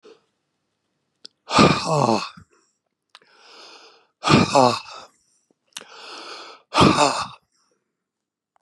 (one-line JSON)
{"exhalation_length": "8.6 s", "exhalation_amplitude": 31733, "exhalation_signal_mean_std_ratio": 0.34, "survey_phase": "beta (2021-08-13 to 2022-03-07)", "age": "65+", "gender": "Male", "wearing_mask": "No", "symptom_none": true, "smoker_status": "Ex-smoker", "respiratory_condition_asthma": false, "respiratory_condition_other": false, "recruitment_source": "REACT", "submission_delay": "2 days", "covid_test_result": "Negative", "covid_test_method": "RT-qPCR", "influenza_a_test_result": "Negative", "influenza_b_test_result": "Negative"}